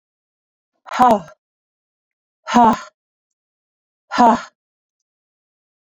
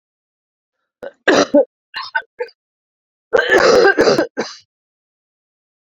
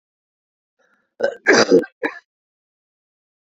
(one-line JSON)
{"exhalation_length": "5.9 s", "exhalation_amplitude": 27846, "exhalation_signal_mean_std_ratio": 0.28, "three_cough_length": "6.0 s", "three_cough_amplitude": 30429, "three_cough_signal_mean_std_ratio": 0.39, "cough_length": "3.6 s", "cough_amplitude": 30740, "cough_signal_mean_std_ratio": 0.28, "survey_phase": "beta (2021-08-13 to 2022-03-07)", "age": "45-64", "gender": "Female", "wearing_mask": "No", "symptom_cough_any": true, "symptom_runny_or_blocked_nose": true, "symptom_headache": true, "symptom_onset": "4 days", "smoker_status": "Never smoked", "respiratory_condition_asthma": false, "respiratory_condition_other": false, "recruitment_source": "Test and Trace", "submission_delay": "2 days", "covid_test_result": "Positive", "covid_test_method": "RT-qPCR", "covid_ct_value": 15.7, "covid_ct_gene": "ORF1ab gene", "covid_ct_mean": 16.2, "covid_viral_load": "4900000 copies/ml", "covid_viral_load_category": "High viral load (>1M copies/ml)"}